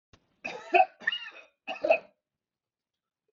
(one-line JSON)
{"three_cough_length": "3.3 s", "three_cough_amplitude": 11040, "three_cough_signal_mean_std_ratio": 0.29, "survey_phase": "beta (2021-08-13 to 2022-03-07)", "age": "45-64", "gender": "Male", "wearing_mask": "No", "symptom_none": true, "smoker_status": "Ex-smoker", "respiratory_condition_asthma": false, "respiratory_condition_other": false, "recruitment_source": "REACT", "submission_delay": "1 day", "covid_test_result": "Negative", "covid_test_method": "RT-qPCR"}